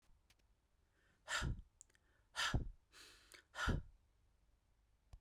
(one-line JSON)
{"exhalation_length": "5.2 s", "exhalation_amplitude": 1752, "exhalation_signal_mean_std_ratio": 0.36, "survey_phase": "beta (2021-08-13 to 2022-03-07)", "age": "45-64", "gender": "Male", "wearing_mask": "No", "symptom_none": true, "smoker_status": "Never smoked", "respiratory_condition_asthma": false, "respiratory_condition_other": false, "recruitment_source": "REACT", "submission_delay": "1 day", "covid_test_result": "Negative", "covid_test_method": "RT-qPCR"}